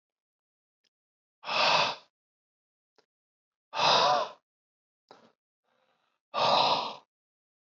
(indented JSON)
{
  "exhalation_length": "7.7 s",
  "exhalation_amplitude": 9196,
  "exhalation_signal_mean_std_ratio": 0.36,
  "survey_phase": "alpha (2021-03-01 to 2021-08-12)",
  "age": "18-44",
  "gender": "Male",
  "wearing_mask": "No",
  "symptom_cough_any": true,
  "symptom_fever_high_temperature": true,
  "symptom_onset": "2 days",
  "smoker_status": "Never smoked",
  "respiratory_condition_asthma": false,
  "respiratory_condition_other": false,
  "recruitment_source": "Test and Trace",
  "submission_delay": "2 days",
  "covid_test_result": "Positive",
  "covid_test_method": "RT-qPCR",
  "covid_ct_value": 16.5,
  "covid_ct_gene": "ORF1ab gene",
  "covid_ct_mean": 17.8,
  "covid_viral_load": "1500000 copies/ml",
  "covid_viral_load_category": "High viral load (>1M copies/ml)"
}